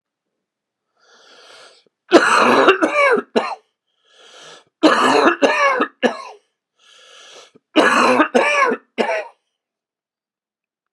{
  "three_cough_length": "10.9 s",
  "three_cough_amplitude": 32768,
  "three_cough_signal_mean_std_ratio": 0.46,
  "survey_phase": "beta (2021-08-13 to 2022-03-07)",
  "age": "65+",
  "gender": "Male",
  "wearing_mask": "No",
  "symptom_cough_any": true,
  "symptom_fatigue": true,
  "symptom_headache": true,
  "symptom_onset": "5 days",
  "smoker_status": "Ex-smoker",
  "respiratory_condition_asthma": true,
  "respiratory_condition_other": false,
  "recruitment_source": "Test and Trace",
  "submission_delay": "2 days",
  "covid_test_result": "Positive",
  "covid_test_method": "RT-qPCR",
  "covid_ct_value": 14.5,
  "covid_ct_gene": "ORF1ab gene",
  "covid_ct_mean": 15.0,
  "covid_viral_load": "12000000 copies/ml",
  "covid_viral_load_category": "High viral load (>1M copies/ml)"
}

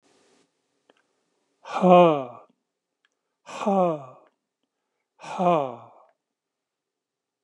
{
  "exhalation_length": "7.4 s",
  "exhalation_amplitude": 25761,
  "exhalation_signal_mean_std_ratio": 0.29,
  "survey_phase": "alpha (2021-03-01 to 2021-08-12)",
  "age": "65+",
  "gender": "Male",
  "wearing_mask": "No",
  "symptom_none": true,
  "smoker_status": "Ex-smoker",
  "respiratory_condition_asthma": false,
  "respiratory_condition_other": false,
  "recruitment_source": "REACT",
  "submission_delay": "1 day",
  "covid_test_result": "Negative",
  "covid_test_method": "RT-qPCR"
}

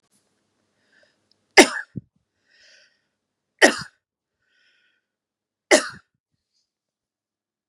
{
  "three_cough_length": "7.7 s",
  "three_cough_amplitude": 32768,
  "three_cough_signal_mean_std_ratio": 0.16,
  "survey_phase": "beta (2021-08-13 to 2022-03-07)",
  "age": "45-64",
  "gender": "Female",
  "wearing_mask": "No",
  "symptom_runny_or_blocked_nose": true,
  "symptom_sore_throat": true,
  "symptom_headache": true,
  "smoker_status": "Ex-smoker",
  "respiratory_condition_asthma": false,
  "respiratory_condition_other": false,
  "recruitment_source": "REACT",
  "submission_delay": "1 day",
  "covid_test_result": "Negative",
  "covid_test_method": "RT-qPCR",
  "influenza_a_test_result": "Negative",
  "influenza_b_test_result": "Negative"
}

